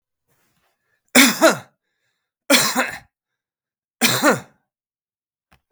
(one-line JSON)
{"three_cough_length": "5.7 s", "three_cough_amplitude": 32768, "three_cough_signal_mean_std_ratio": 0.33, "survey_phase": "beta (2021-08-13 to 2022-03-07)", "age": "65+", "gender": "Male", "wearing_mask": "No", "symptom_none": true, "smoker_status": "Never smoked", "respiratory_condition_asthma": false, "respiratory_condition_other": false, "recruitment_source": "REACT", "submission_delay": "3 days", "covid_test_result": "Negative", "covid_test_method": "RT-qPCR"}